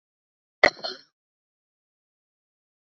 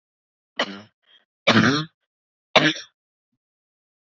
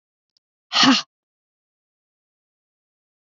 cough_length: 3.0 s
cough_amplitude: 30775
cough_signal_mean_std_ratio: 0.12
three_cough_length: 4.2 s
three_cough_amplitude: 28545
three_cough_signal_mean_std_ratio: 0.3
exhalation_length: 3.2 s
exhalation_amplitude: 25792
exhalation_signal_mean_std_ratio: 0.23
survey_phase: beta (2021-08-13 to 2022-03-07)
age: 18-44
gender: Female
wearing_mask: 'No'
symptom_runny_or_blocked_nose: true
symptom_onset: 7 days
smoker_status: Never smoked
respiratory_condition_asthma: true
respiratory_condition_other: false
recruitment_source: REACT
submission_delay: 2 days
covid_test_result: Negative
covid_test_method: RT-qPCR
influenza_a_test_result: Negative
influenza_b_test_result: Negative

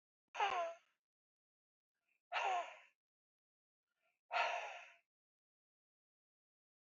exhalation_length: 7.0 s
exhalation_amplitude: 1920
exhalation_signal_mean_std_ratio: 0.33
survey_phase: beta (2021-08-13 to 2022-03-07)
age: 45-64
gender: Female
wearing_mask: 'No'
symptom_cough_any: true
symptom_runny_or_blocked_nose: true
smoker_status: Ex-smoker
respiratory_condition_asthma: false
respiratory_condition_other: false
recruitment_source: REACT
submission_delay: 3 days
covid_test_result: Negative
covid_test_method: RT-qPCR
influenza_a_test_result: Negative
influenza_b_test_result: Negative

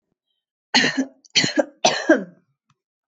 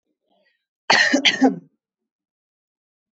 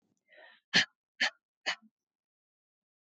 three_cough_length: 3.1 s
three_cough_amplitude: 25739
three_cough_signal_mean_std_ratio: 0.39
cough_length: 3.2 s
cough_amplitude: 24091
cough_signal_mean_std_ratio: 0.33
exhalation_length: 3.1 s
exhalation_amplitude: 9710
exhalation_signal_mean_std_ratio: 0.22
survey_phase: beta (2021-08-13 to 2022-03-07)
age: 18-44
gender: Female
wearing_mask: 'No'
symptom_cough_any: true
symptom_runny_or_blocked_nose: true
symptom_onset: 2 days
smoker_status: Ex-smoker
respiratory_condition_asthma: false
respiratory_condition_other: false
recruitment_source: Test and Trace
submission_delay: 1 day
covid_test_result: Positive
covid_test_method: LAMP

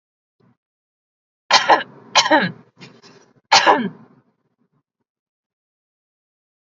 three_cough_length: 6.7 s
three_cough_amplitude: 32767
three_cough_signal_mean_std_ratio: 0.29
survey_phase: alpha (2021-03-01 to 2021-08-12)
age: 18-44
gender: Female
wearing_mask: 'No'
symptom_none: true
smoker_status: Never smoked
respiratory_condition_asthma: false
respiratory_condition_other: false
recruitment_source: REACT
submission_delay: 2 days
covid_test_result: Negative
covid_test_method: RT-qPCR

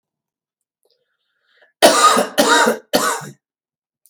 cough_length: 4.1 s
cough_amplitude: 32768
cough_signal_mean_std_ratio: 0.41
survey_phase: beta (2021-08-13 to 2022-03-07)
age: 65+
gender: Male
wearing_mask: 'No'
symptom_none: true
smoker_status: Never smoked
respiratory_condition_asthma: true
respiratory_condition_other: false
recruitment_source: REACT
submission_delay: 3 days
covid_test_result: Negative
covid_test_method: RT-qPCR
influenza_a_test_result: Negative
influenza_b_test_result: Negative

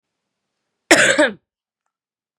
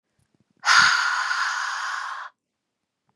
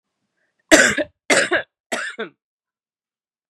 cough_length: 2.4 s
cough_amplitude: 32768
cough_signal_mean_std_ratio: 0.31
exhalation_length: 3.2 s
exhalation_amplitude: 21866
exhalation_signal_mean_std_ratio: 0.53
three_cough_length: 3.5 s
three_cough_amplitude: 32768
three_cough_signal_mean_std_ratio: 0.34
survey_phase: beta (2021-08-13 to 2022-03-07)
age: 18-44
gender: Female
wearing_mask: 'No'
symptom_cough_any: true
symptom_runny_or_blocked_nose: true
symptom_sore_throat: true
symptom_fatigue: true
symptom_loss_of_taste: true
symptom_onset: 2 days
smoker_status: Never smoked
respiratory_condition_asthma: false
respiratory_condition_other: false
recruitment_source: REACT
submission_delay: 2 days
covid_test_result: Negative
covid_test_method: RT-qPCR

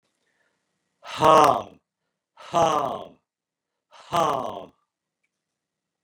exhalation_length: 6.0 s
exhalation_amplitude: 23258
exhalation_signal_mean_std_ratio: 0.32
survey_phase: beta (2021-08-13 to 2022-03-07)
age: 65+
gender: Male
wearing_mask: 'No'
symptom_runny_or_blocked_nose: true
symptom_sore_throat: true
smoker_status: Ex-smoker
respiratory_condition_asthma: false
respiratory_condition_other: false
recruitment_source: REACT
submission_delay: 1 day
covid_test_result: Negative
covid_test_method: RT-qPCR
influenza_a_test_result: Negative
influenza_b_test_result: Negative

